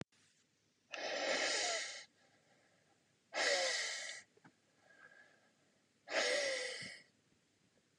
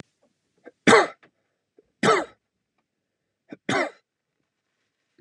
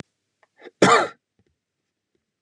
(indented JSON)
{
  "exhalation_length": "8.0 s",
  "exhalation_amplitude": 2470,
  "exhalation_signal_mean_std_ratio": 0.5,
  "three_cough_length": "5.2 s",
  "three_cough_amplitude": 28625,
  "three_cough_signal_mean_std_ratio": 0.25,
  "cough_length": "2.4 s",
  "cough_amplitude": 29022,
  "cough_signal_mean_std_ratio": 0.25,
  "survey_phase": "beta (2021-08-13 to 2022-03-07)",
  "age": "18-44",
  "gender": "Male",
  "wearing_mask": "No",
  "symptom_runny_or_blocked_nose": true,
  "symptom_change_to_sense_of_smell_or_taste": true,
  "symptom_onset": "4 days",
  "smoker_status": "Never smoked",
  "respiratory_condition_asthma": false,
  "respiratory_condition_other": false,
  "recruitment_source": "Test and Trace",
  "submission_delay": "2 days",
  "covid_test_result": "Positive",
  "covid_test_method": "RT-qPCR",
  "covid_ct_value": 17.7,
  "covid_ct_gene": "ORF1ab gene",
  "covid_ct_mean": 18.7,
  "covid_viral_load": "750000 copies/ml",
  "covid_viral_load_category": "Low viral load (10K-1M copies/ml)"
}